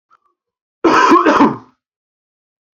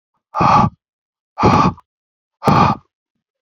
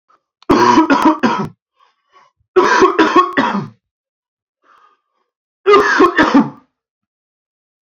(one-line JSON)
{"cough_length": "2.7 s", "cough_amplitude": 30861, "cough_signal_mean_std_ratio": 0.43, "exhalation_length": "3.4 s", "exhalation_amplitude": 31455, "exhalation_signal_mean_std_ratio": 0.45, "three_cough_length": "7.9 s", "three_cough_amplitude": 28485, "three_cough_signal_mean_std_ratio": 0.48, "survey_phase": "alpha (2021-03-01 to 2021-08-12)", "age": "18-44", "gender": "Male", "wearing_mask": "No", "symptom_cough_any": true, "symptom_fever_high_temperature": true, "symptom_headache": true, "symptom_onset": "3 days", "smoker_status": "Never smoked", "respiratory_condition_asthma": false, "respiratory_condition_other": false, "recruitment_source": "Test and Trace", "submission_delay": "2 days", "covid_test_result": "Positive", "covid_test_method": "RT-qPCR", "covid_ct_value": 15.0, "covid_ct_gene": "ORF1ab gene", "covid_ct_mean": 15.2, "covid_viral_load": "10000000 copies/ml", "covid_viral_load_category": "High viral load (>1M copies/ml)"}